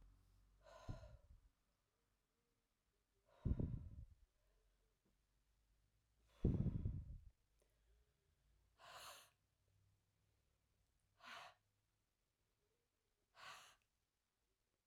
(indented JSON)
{
  "exhalation_length": "14.9 s",
  "exhalation_amplitude": 1680,
  "exhalation_signal_mean_std_ratio": 0.26,
  "survey_phase": "beta (2021-08-13 to 2022-03-07)",
  "age": "45-64",
  "gender": "Female",
  "wearing_mask": "No",
  "symptom_none": true,
  "smoker_status": "Ex-smoker",
  "respiratory_condition_asthma": false,
  "respiratory_condition_other": false,
  "recruitment_source": "REACT",
  "submission_delay": "2 days",
  "covid_test_result": "Negative",
  "covid_test_method": "RT-qPCR"
}